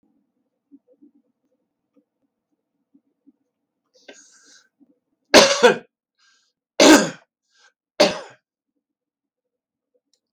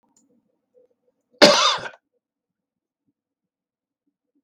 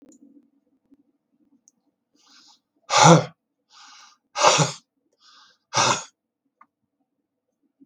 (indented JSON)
{
  "three_cough_length": "10.3 s",
  "three_cough_amplitude": 32768,
  "three_cough_signal_mean_std_ratio": 0.21,
  "cough_length": "4.4 s",
  "cough_amplitude": 32768,
  "cough_signal_mean_std_ratio": 0.21,
  "exhalation_length": "7.9 s",
  "exhalation_amplitude": 32616,
  "exhalation_signal_mean_std_ratio": 0.25,
  "survey_phase": "beta (2021-08-13 to 2022-03-07)",
  "age": "65+",
  "gender": "Male",
  "wearing_mask": "No",
  "symptom_runny_or_blocked_nose": true,
  "smoker_status": "Never smoked",
  "respiratory_condition_asthma": false,
  "respiratory_condition_other": false,
  "recruitment_source": "REACT",
  "submission_delay": "2 days",
  "covid_test_result": "Negative",
  "covid_test_method": "RT-qPCR",
  "influenza_a_test_result": "Negative",
  "influenza_b_test_result": "Negative"
}